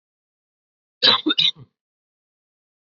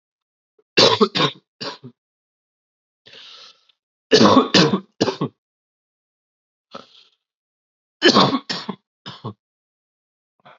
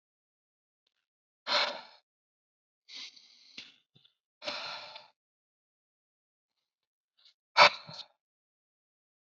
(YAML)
cough_length: 2.8 s
cough_amplitude: 25223
cough_signal_mean_std_ratio: 0.28
three_cough_length: 10.6 s
three_cough_amplitude: 30571
three_cough_signal_mean_std_ratio: 0.31
exhalation_length: 9.2 s
exhalation_amplitude: 18647
exhalation_signal_mean_std_ratio: 0.18
survey_phase: beta (2021-08-13 to 2022-03-07)
age: 18-44
gender: Male
wearing_mask: 'No'
symptom_cough_any: true
symptom_new_continuous_cough: true
symptom_runny_or_blocked_nose: true
symptom_sore_throat: true
symptom_fatigue: true
symptom_fever_high_temperature: true
symptom_headache: true
symptom_onset: 2 days
smoker_status: Never smoked
respiratory_condition_asthma: true
respiratory_condition_other: false
recruitment_source: Test and Trace
submission_delay: 1 day
covid_test_result: Positive
covid_test_method: RT-qPCR
covid_ct_value: 13.4
covid_ct_gene: ORF1ab gene